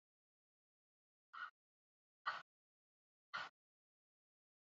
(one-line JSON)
{"exhalation_length": "4.7 s", "exhalation_amplitude": 1080, "exhalation_signal_mean_std_ratio": 0.22, "survey_phase": "beta (2021-08-13 to 2022-03-07)", "age": "18-44", "gender": "Female", "wearing_mask": "No", "symptom_none": true, "smoker_status": "Ex-smoker", "respiratory_condition_asthma": false, "respiratory_condition_other": false, "recruitment_source": "Test and Trace", "submission_delay": "1 day", "covid_test_result": "Negative", "covid_test_method": "RT-qPCR"}